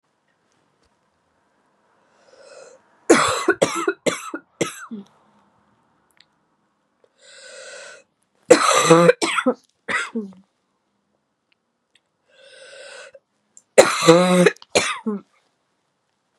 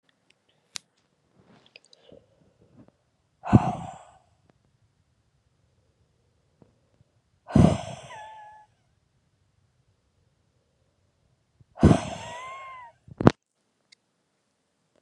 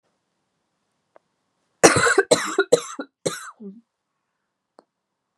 {"three_cough_length": "16.4 s", "three_cough_amplitude": 32768, "three_cough_signal_mean_std_ratio": 0.32, "exhalation_length": "15.0 s", "exhalation_amplitude": 32768, "exhalation_signal_mean_std_ratio": 0.19, "cough_length": "5.4 s", "cough_amplitude": 32767, "cough_signal_mean_std_ratio": 0.28, "survey_phase": "beta (2021-08-13 to 2022-03-07)", "age": "18-44", "gender": "Female", "wearing_mask": "No", "symptom_cough_any": true, "symptom_runny_or_blocked_nose": true, "symptom_sore_throat": true, "symptom_fatigue": true, "symptom_fever_high_temperature": true, "symptom_headache": true, "symptom_change_to_sense_of_smell_or_taste": true, "symptom_loss_of_taste": true, "symptom_onset": "3 days", "smoker_status": "Ex-smoker", "respiratory_condition_asthma": false, "respiratory_condition_other": false, "recruitment_source": "Test and Trace", "submission_delay": "1 day", "covid_test_result": "Positive", "covid_test_method": "RT-qPCR"}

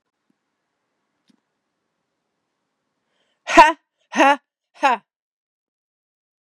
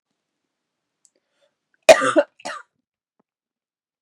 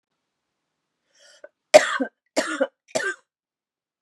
{"exhalation_length": "6.5 s", "exhalation_amplitude": 32768, "exhalation_signal_mean_std_ratio": 0.21, "cough_length": "4.0 s", "cough_amplitude": 32768, "cough_signal_mean_std_ratio": 0.19, "three_cough_length": "4.0 s", "three_cough_amplitude": 32768, "three_cough_signal_mean_std_ratio": 0.24, "survey_phase": "beta (2021-08-13 to 2022-03-07)", "age": "18-44", "gender": "Female", "wearing_mask": "No", "symptom_runny_or_blocked_nose": true, "symptom_fatigue": true, "smoker_status": "Ex-smoker", "respiratory_condition_asthma": false, "respiratory_condition_other": false, "recruitment_source": "Test and Trace", "submission_delay": "1 day", "covid_test_result": "Positive", "covid_test_method": "RT-qPCR"}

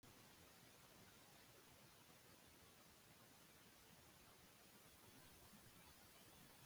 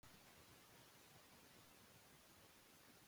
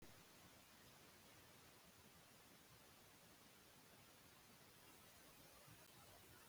{"three_cough_length": "6.7 s", "three_cough_amplitude": 77, "three_cough_signal_mean_std_ratio": 1.22, "cough_length": "3.1 s", "cough_amplitude": 87, "cough_signal_mean_std_ratio": 1.21, "exhalation_length": "6.5 s", "exhalation_amplitude": 105, "exhalation_signal_mean_std_ratio": 1.21, "survey_phase": "beta (2021-08-13 to 2022-03-07)", "age": "65+", "gender": "Male", "wearing_mask": "No", "symptom_none": true, "smoker_status": "Ex-smoker", "respiratory_condition_asthma": false, "respiratory_condition_other": false, "recruitment_source": "REACT", "submission_delay": "1 day", "covid_test_result": "Negative", "covid_test_method": "RT-qPCR", "influenza_a_test_result": "Negative", "influenza_b_test_result": "Negative"}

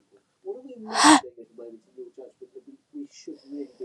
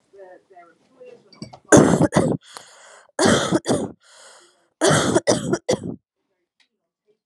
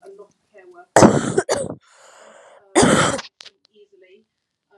{"exhalation_length": "3.8 s", "exhalation_amplitude": 28293, "exhalation_signal_mean_std_ratio": 0.3, "three_cough_length": "7.3 s", "three_cough_amplitude": 32767, "three_cough_signal_mean_std_ratio": 0.41, "cough_length": "4.8 s", "cough_amplitude": 32768, "cough_signal_mean_std_ratio": 0.35, "survey_phase": "alpha (2021-03-01 to 2021-08-12)", "age": "18-44", "gender": "Female", "wearing_mask": "No", "symptom_new_continuous_cough": true, "symptom_diarrhoea": true, "symptom_fatigue": true, "symptom_fever_high_temperature": true, "symptom_headache": true, "symptom_change_to_sense_of_smell_or_taste": true, "symptom_loss_of_taste": true, "symptom_onset": "7 days", "smoker_status": "Never smoked", "respiratory_condition_asthma": false, "respiratory_condition_other": false, "recruitment_source": "Test and Trace", "submission_delay": "2 days", "covid_test_result": "Positive", "covid_test_method": "RT-qPCR", "covid_ct_value": 21.8, "covid_ct_gene": "N gene", "covid_ct_mean": 21.8, "covid_viral_load": "68000 copies/ml", "covid_viral_load_category": "Low viral load (10K-1M copies/ml)"}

